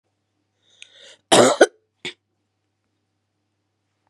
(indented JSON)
{
  "cough_length": "4.1 s",
  "cough_amplitude": 32680,
  "cough_signal_mean_std_ratio": 0.22,
  "survey_phase": "beta (2021-08-13 to 2022-03-07)",
  "age": "65+",
  "gender": "Female",
  "wearing_mask": "No",
  "symptom_cough_any": true,
  "symptom_new_continuous_cough": true,
  "symptom_runny_or_blocked_nose": true,
  "symptom_shortness_of_breath": true,
  "symptom_sore_throat": true,
  "symptom_fatigue": true,
  "symptom_fever_high_temperature": true,
  "symptom_headache": true,
  "symptom_change_to_sense_of_smell_or_taste": true,
  "symptom_loss_of_taste": true,
  "symptom_other": true,
  "smoker_status": "Never smoked",
  "respiratory_condition_asthma": false,
  "respiratory_condition_other": false,
  "recruitment_source": "Test and Trace",
  "submission_delay": "2 days",
  "covid_test_result": "Positive",
  "covid_test_method": "RT-qPCR",
  "covid_ct_value": 22.4,
  "covid_ct_gene": "ORF1ab gene",
  "covid_ct_mean": 22.9,
  "covid_viral_load": "32000 copies/ml",
  "covid_viral_load_category": "Low viral load (10K-1M copies/ml)"
}